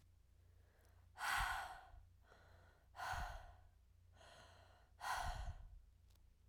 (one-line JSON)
{"exhalation_length": "6.5 s", "exhalation_amplitude": 1151, "exhalation_signal_mean_std_ratio": 0.52, "survey_phase": "alpha (2021-03-01 to 2021-08-12)", "age": "18-44", "gender": "Female", "wearing_mask": "No", "symptom_cough_any": true, "symptom_headache": true, "symptom_onset": "4 days", "smoker_status": "Never smoked", "respiratory_condition_asthma": false, "respiratory_condition_other": false, "recruitment_source": "Test and Trace", "submission_delay": "2 days", "covid_test_result": "Positive", "covid_test_method": "RT-qPCR", "covid_ct_value": 23.9, "covid_ct_gene": "ORF1ab gene", "covid_ct_mean": 24.5, "covid_viral_load": "9300 copies/ml", "covid_viral_load_category": "Minimal viral load (< 10K copies/ml)"}